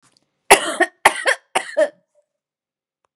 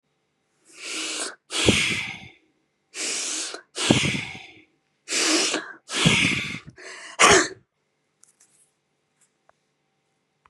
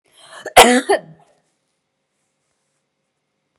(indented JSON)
{
  "three_cough_length": "3.2 s",
  "three_cough_amplitude": 32768,
  "three_cough_signal_mean_std_ratio": 0.32,
  "exhalation_length": "10.5 s",
  "exhalation_amplitude": 26231,
  "exhalation_signal_mean_std_ratio": 0.43,
  "cough_length": "3.6 s",
  "cough_amplitude": 32768,
  "cough_signal_mean_std_ratio": 0.24,
  "survey_phase": "beta (2021-08-13 to 2022-03-07)",
  "age": "45-64",
  "gender": "Female",
  "wearing_mask": "No",
  "symptom_none": true,
  "smoker_status": "Never smoked",
  "respiratory_condition_asthma": false,
  "respiratory_condition_other": false,
  "recruitment_source": "REACT",
  "submission_delay": "2 days",
  "covid_test_result": "Negative",
  "covid_test_method": "RT-qPCR",
  "influenza_a_test_result": "Negative",
  "influenza_b_test_result": "Negative"
}